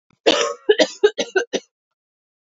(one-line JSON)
{"three_cough_length": "2.6 s", "three_cough_amplitude": 28256, "three_cough_signal_mean_std_ratio": 0.38, "survey_phase": "beta (2021-08-13 to 2022-03-07)", "age": "18-44", "gender": "Female", "wearing_mask": "No", "symptom_cough_any": true, "symptom_runny_or_blocked_nose": true, "symptom_sore_throat": true, "symptom_headache": true, "symptom_onset": "3 days", "smoker_status": "Never smoked", "respiratory_condition_asthma": false, "respiratory_condition_other": false, "recruitment_source": "Test and Trace", "submission_delay": "1 day", "covid_test_result": "Negative", "covid_test_method": "ePCR"}